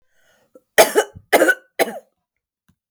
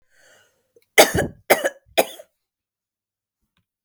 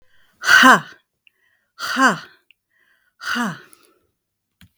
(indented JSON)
{
  "cough_length": "2.9 s",
  "cough_amplitude": 32768,
  "cough_signal_mean_std_ratio": 0.32,
  "three_cough_length": "3.8 s",
  "three_cough_amplitude": 32768,
  "three_cough_signal_mean_std_ratio": 0.24,
  "exhalation_length": "4.8 s",
  "exhalation_amplitude": 32768,
  "exhalation_signal_mean_std_ratio": 0.32,
  "survey_phase": "beta (2021-08-13 to 2022-03-07)",
  "age": "45-64",
  "gender": "Female",
  "wearing_mask": "No",
  "symptom_none": true,
  "smoker_status": "Never smoked",
  "respiratory_condition_asthma": false,
  "respiratory_condition_other": false,
  "recruitment_source": "REACT",
  "submission_delay": "1 day",
  "covid_test_result": "Negative",
  "covid_test_method": "RT-qPCR",
  "influenza_a_test_result": "Negative",
  "influenza_b_test_result": "Negative"
}